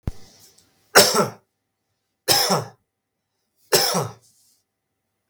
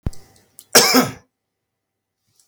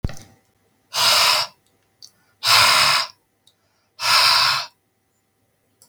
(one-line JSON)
{"three_cough_length": "5.3 s", "three_cough_amplitude": 32768, "three_cough_signal_mean_std_ratio": 0.34, "cough_length": "2.5 s", "cough_amplitude": 32768, "cough_signal_mean_std_ratio": 0.31, "exhalation_length": "5.9 s", "exhalation_amplitude": 32605, "exhalation_signal_mean_std_ratio": 0.48, "survey_phase": "beta (2021-08-13 to 2022-03-07)", "age": "45-64", "gender": "Male", "wearing_mask": "No", "symptom_cough_any": true, "symptom_runny_or_blocked_nose": true, "symptom_onset": "12 days", "smoker_status": "Never smoked", "respiratory_condition_asthma": false, "respiratory_condition_other": false, "recruitment_source": "REACT", "submission_delay": "1 day", "covid_test_result": "Negative", "covid_test_method": "RT-qPCR", "influenza_a_test_result": "Negative", "influenza_b_test_result": "Negative"}